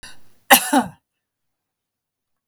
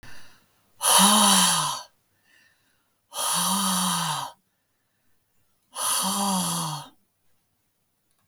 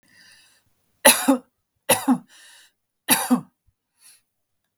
{"cough_length": "2.5 s", "cough_amplitude": 32768, "cough_signal_mean_std_ratio": 0.25, "exhalation_length": "8.3 s", "exhalation_amplitude": 19637, "exhalation_signal_mean_std_ratio": 0.5, "three_cough_length": "4.8 s", "three_cough_amplitude": 32768, "three_cough_signal_mean_std_ratio": 0.3, "survey_phase": "beta (2021-08-13 to 2022-03-07)", "age": "65+", "gender": "Female", "wearing_mask": "No", "symptom_cough_any": true, "symptom_runny_or_blocked_nose": true, "symptom_sore_throat": true, "symptom_onset": "11 days", "smoker_status": "Never smoked", "respiratory_condition_asthma": false, "respiratory_condition_other": false, "recruitment_source": "REACT", "submission_delay": "1 day", "covid_test_result": "Negative", "covid_test_method": "RT-qPCR", "influenza_a_test_result": "Negative", "influenza_b_test_result": "Negative"}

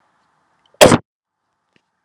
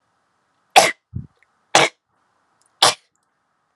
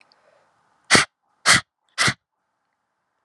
{"cough_length": "2.0 s", "cough_amplitude": 32768, "cough_signal_mean_std_ratio": 0.22, "three_cough_length": "3.8 s", "three_cough_amplitude": 32768, "three_cough_signal_mean_std_ratio": 0.25, "exhalation_length": "3.2 s", "exhalation_amplitude": 32768, "exhalation_signal_mean_std_ratio": 0.27, "survey_phase": "beta (2021-08-13 to 2022-03-07)", "age": "18-44", "gender": "Female", "wearing_mask": "No", "symptom_none": true, "smoker_status": "Never smoked", "respiratory_condition_asthma": false, "respiratory_condition_other": false, "recruitment_source": "Test and Trace", "submission_delay": "1 day", "covid_test_result": "Positive", "covid_test_method": "RT-qPCR", "covid_ct_value": 29.8, "covid_ct_gene": "ORF1ab gene"}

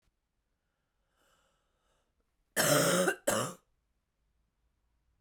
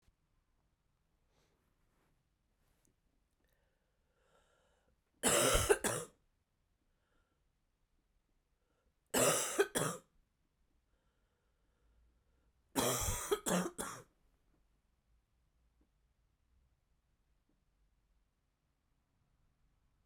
{"cough_length": "5.2 s", "cough_amplitude": 6339, "cough_signal_mean_std_ratio": 0.32, "three_cough_length": "20.1 s", "three_cough_amplitude": 5300, "three_cough_signal_mean_std_ratio": 0.27, "survey_phase": "beta (2021-08-13 to 2022-03-07)", "age": "18-44", "gender": "Female", "wearing_mask": "No", "symptom_cough_any": true, "symptom_runny_or_blocked_nose": true, "symptom_shortness_of_breath": true, "symptom_fatigue": true, "symptom_fever_high_temperature": true, "symptom_headache": true, "symptom_change_to_sense_of_smell_or_taste": true, "symptom_other": true, "symptom_onset": "2 days", "smoker_status": "Never smoked", "respiratory_condition_asthma": false, "respiratory_condition_other": false, "recruitment_source": "Test and Trace", "submission_delay": "1 day", "covid_test_result": "Positive", "covid_test_method": "ePCR"}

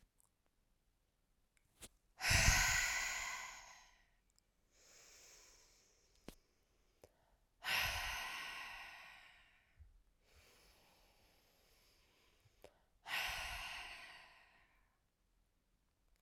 {"exhalation_length": "16.2 s", "exhalation_amplitude": 3993, "exhalation_signal_mean_std_ratio": 0.34, "survey_phase": "alpha (2021-03-01 to 2021-08-12)", "age": "18-44", "gender": "Female", "wearing_mask": "No", "symptom_cough_any": true, "symptom_fatigue": true, "symptom_headache": true, "symptom_onset": "3 days", "smoker_status": "Never smoked", "respiratory_condition_asthma": false, "respiratory_condition_other": false, "recruitment_source": "Test and Trace", "submission_delay": "1 day", "covid_test_result": "Positive", "covid_test_method": "RT-qPCR", "covid_ct_value": 21.2, "covid_ct_gene": "ORF1ab gene", "covid_ct_mean": 22.1, "covid_viral_load": "55000 copies/ml", "covid_viral_load_category": "Low viral load (10K-1M copies/ml)"}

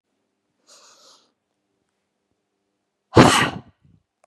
{"exhalation_length": "4.3 s", "exhalation_amplitude": 32767, "exhalation_signal_mean_std_ratio": 0.21, "survey_phase": "beta (2021-08-13 to 2022-03-07)", "age": "45-64", "gender": "Female", "wearing_mask": "No", "symptom_none": true, "smoker_status": "Never smoked", "respiratory_condition_asthma": false, "respiratory_condition_other": false, "recruitment_source": "REACT", "submission_delay": "1 day", "covid_test_result": "Negative", "covid_test_method": "RT-qPCR", "influenza_a_test_result": "Negative", "influenza_b_test_result": "Negative"}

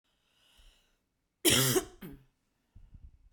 {"cough_length": "3.3 s", "cough_amplitude": 10141, "cough_signal_mean_std_ratio": 0.3, "survey_phase": "beta (2021-08-13 to 2022-03-07)", "age": "45-64", "gender": "Female", "wearing_mask": "No", "symptom_none": true, "symptom_onset": "7 days", "smoker_status": "Ex-smoker", "respiratory_condition_asthma": false, "respiratory_condition_other": false, "recruitment_source": "REACT", "submission_delay": "1 day", "covid_test_result": "Negative", "covid_test_method": "RT-qPCR", "influenza_a_test_result": "Unknown/Void", "influenza_b_test_result": "Unknown/Void"}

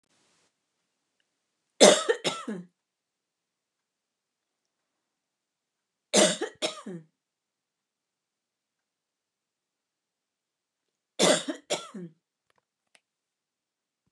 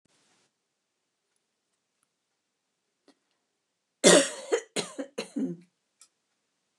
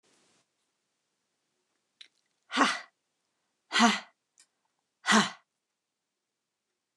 {"three_cough_length": "14.1 s", "three_cough_amplitude": 27827, "three_cough_signal_mean_std_ratio": 0.21, "cough_length": "6.8 s", "cough_amplitude": 20384, "cough_signal_mean_std_ratio": 0.21, "exhalation_length": "7.0 s", "exhalation_amplitude": 14267, "exhalation_signal_mean_std_ratio": 0.24, "survey_phase": "beta (2021-08-13 to 2022-03-07)", "age": "65+", "gender": "Female", "wearing_mask": "No", "symptom_none": true, "smoker_status": "Ex-smoker", "respiratory_condition_asthma": false, "respiratory_condition_other": false, "recruitment_source": "REACT", "submission_delay": "1 day", "covid_test_result": "Negative", "covid_test_method": "RT-qPCR", "influenza_a_test_result": "Negative", "influenza_b_test_result": "Negative"}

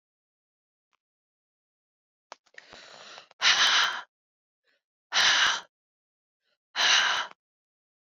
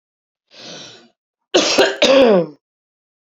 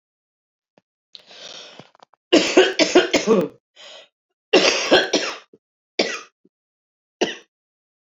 {"exhalation_length": "8.2 s", "exhalation_amplitude": 12743, "exhalation_signal_mean_std_ratio": 0.35, "cough_length": "3.3 s", "cough_amplitude": 29299, "cough_signal_mean_std_ratio": 0.43, "three_cough_length": "8.1 s", "three_cough_amplitude": 31101, "three_cough_signal_mean_std_ratio": 0.37, "survey_phase": "beta (2021-08-13 to 2022-03-07)", "age": "45-64", "gender": "Female", "wearing_mask": "Yes", "symptom_cough_any": true, "symptom_runny_or_blocked_nose": true, "symptom_fatigue": true, "symptom_change_to_sense_of_smell_or_taste": true, "symptom_onset": "5 days", "smoker_status": "Ex-smoker", "respiratory_condition_asthma": false, "respiratory_condition_other": false, "recruitment_source": "Test and Trace", "submission_delay": "3 days", "covid_test_result": "Positive", "covid_test_method": "RT-qPCR", "covid_ct_value": 17.8, "covid_ct_gene": "ORF1ab gene"}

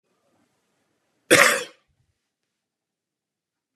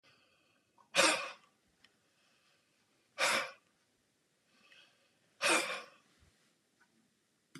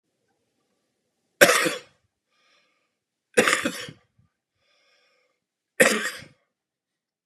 {"cough_length": "3.8 s", "cough_amplitude": 32767, "cough_signal_mean_std_ratio": 0.21, "exhalation_length": "7.6 s", "exhalation_amplitude": 7360, "exhalation_signal_mean_std_ratio": 0.28, "three_cough_length": "7.3 s", "three_cough_amplitude": 32767, "three_cough_signal_mean_std_ratio": 0.25, "survey_phase": "beta (2021-08-13 to 2022-03-07)", "age": "65+", "gender": "Male", "wearing_mask": "No", "symptom_cough_any": true, "symptom_onset": "12 days", "smoker_status": "Ex-smoker", "respiratory_condition_asthma": true, "respiratory_condition_other": false, "recruitment_source": "REACT", "submission_delay": "5 days", "covid_test_result": "Negative", "covid_test_method": "RT-qPCR", "influenza_a_test_result": "Negative", "influenza_b_test_result": "Negative"}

